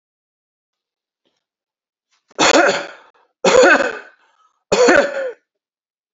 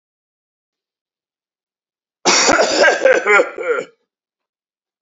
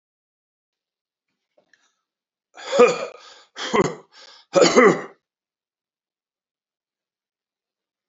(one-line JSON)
{"three_cough_length": "6.1 s", "three_cough_amplitude": 31500, "three_cough_signal_mean_std_ratio": 0.39, "cough_length": "5.0 s", "cough_amplitude": 30971, "cough_signal_mean_std_ratio": 0.43, "exhalation_length": "8.1 s", "exhalation_amplitude": 28786, "exhalation_signal_mean_std_ratio": 0.26, "survey_phase": "beta (2021-08-13 to 2022-03-07)", "age": "45-64", "gender": "Male", "wearing_mask": "No", "symptom_none": true, "smoker_status": "Ex-smoker", "respiratory_condition_asthma": false, "respiratory_condition_other": false, "recruitment_source": "REACT", "submission_delay": "3 days", "covid_test_result": "Negative", "covid_test_method": "RT-qPCR", "influenza_a_test_result": "Negative", "influenza_b_test_result": "Negative"}